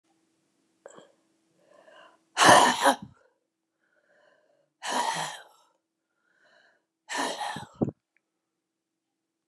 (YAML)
exhalation_length: 9.5 s
exhalation_amplitude: 22409
exhalation_signal_mean_std_ratio: 0.27
survey_phase: beta (2021-08-13 to 2022-03-07)
age: 65+
gender: Female
wearing_mask: 'No'
symptom_cough_any: true
symptom_runny_or_blocked_nose: true
symptom_sore_throat: true
symptom_fatigue: true
symptom_headache: true
symptom_change_to_sense_of_smell_or_taste: true
symptom_loss_of_taste: true
symptom_onset: 6 days
smoker_status: Never smoked
respiratory_condition_asthma: false
respiratory_condition_other: false
recruitment_source: Test and Trace
submission_delay: 2 days
covid_test_result: Positive
covid_test_method: RT-qPCR
covid_ct_value: 19.1
covid_ct_gene: ORF1ab gene